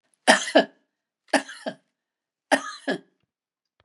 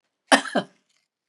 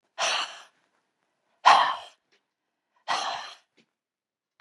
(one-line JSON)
{"three_cough_length": "3.8 s", "three_cough_amplitude": 30196, "three_cough_signal_mean_std_ratio": 0.28, "cough_length": "1.3 s", "cough_amplitude": 25847, "cough_signal_mean_std_ratio": 0.27, "exhalation_length": "4.6 s", "exhalation_amplitude": 21728, "exhalation_signal_mean_std_ratio": 0.3, "survey_phase": "beta (2021-08-13 to 2022-03-07)", "age": "65+", "gender": "Female", "wearing_mask": "No", "symptom_none": true, "smoker_status": "Never smoked", "respiratory_condition_asthma": false, "respiratory_condition_other": false, "recruitment_source": "REACT", "submission_delay": "2 days", "covid_test_result": "Negative", "covid_test_method": "RT-qPCR", "influenza_a_test_result": "Negative", "influenza_b_test_result": "Negative"}